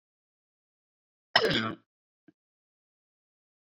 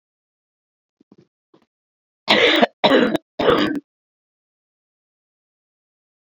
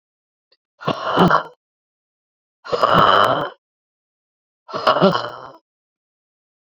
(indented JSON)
{
  "cough_length": "3.8 s",
  "cough_amplitude": 18721,
  "cough_signal_mean_std_ratio": 0.22,
  "three_cough_length": "6.2 s",
  "three_cough_amplitude": 28392,
  "three_cough_signal_mean_std_ratio": 0.33,
  "exhalation_length": "6.7 s",
  "exhalation_amplitude": 32768,
  "exhalation_signal_mean_std_ratio": 0.39,
  "survey_phase": "beta (2021-08-13 to 2022-03-07)",
  "age": "65+",
  "gender": "Female",
  "wearing_mask": "No",
  "symptom_new_continuous_cough": true,
  "symptom_runny_or_blocked_nose": true,
  "symptom_sore_throat": true,
  "symptom_fatigue": true,
  "symptom_change_to_sense_of_smell_or_taste": true,
  "symptom_onset": "4 days",
  "smoker_status": "Ex-smoker",
  "respiratory_condition_asthma": false,
  "respiratory_condition_other": false,
  "recruitment_source": "Test and Trace",
  "submission_delay": "2 days",
  "covid_test_result": "Negative",
  "covid_test_method": "RT-qPCR"
}